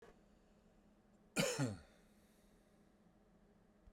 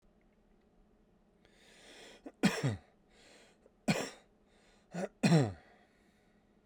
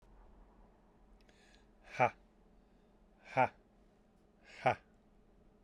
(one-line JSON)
{"cough_length": "3.9 s", "cough_amplitude": 2437, "cough_signal_mean_std_ratio": 0.32, "three_cough_length": "6.7 s", "three_cough_amplitude": 6436, "three_cough_signal_mean_std_ratio": 0.3, "exhalation_length": "5.6 s", "exhalation_amplitude": 5198, "exhalation_signal_mean_std_ratio": 0.24, "survey_phase": "beta (2021-08-13 to 2022-03-07)", "age": "45-64", "gender": "Male", "wearing_mask": "No", "symptom_none": true, "smoker_status": "Never smoked", "respiratory_condition_asthma": false, "respiratory_condition_other": false, "recruitment_source": "REACT", "submission_delay": "1 day", "covid_test_result": "Negative", "covid_test_method": "RT-qPCR"}